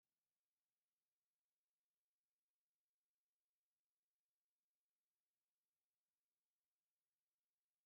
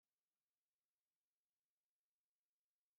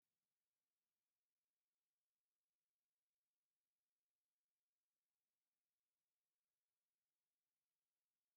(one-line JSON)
{"exhalation_length": "7.9 s", "exhalation_amplitude": 2, "exhalation_signal_mean_std_ratio": 0.24, "cough_length": "3.0 s", "cough_amplitude": 2, "cough_signal_mean_std_ratio": 0.24, "three_cough_length": "8.4 s", "three_cough_amplitude": 2, "three_cough_signal_mean_std_ratio": 0.25, "survey_phase": "beta (2021-08-13 to 2022-03-07)", "age": "18-44", "gender": "Female", "wearing_mask": "No", "symptom_runny_or_blocked_nose": true, "symptom_sore_throat": true, "symptom_onset": "5 days", "smoker_status": "Never smoked", "respiratory_condition_asthma": false, "respiratory_condition_other": false, "recruitment_source": "Test and Trace", "submission_delay": "2 days", "covid_test_result": "Positive", "covid_test_method": "RT-qPCR", "covid_ct_value": 25.6, "covid_ct_gene": "ORF1ab gene"}